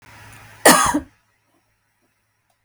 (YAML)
cough_length: 2.6 s
cough_amplitude: 32768
cough_signal_mean_std_ratio: 0.28
survey_phase: beta (2021-08-13 to 2022-03-07)
age: 18-44
gender: Female
wearing_mask: 'No'
symptom_none: true
smoker_status: Ex-smoker
respiratory_condition_asthma: false
respiratory_condition_other: false
recruitment_source: Test and Trace
submission_delay: 3 days
covid_test_result: Negative
covid_test_method: RT-qPCR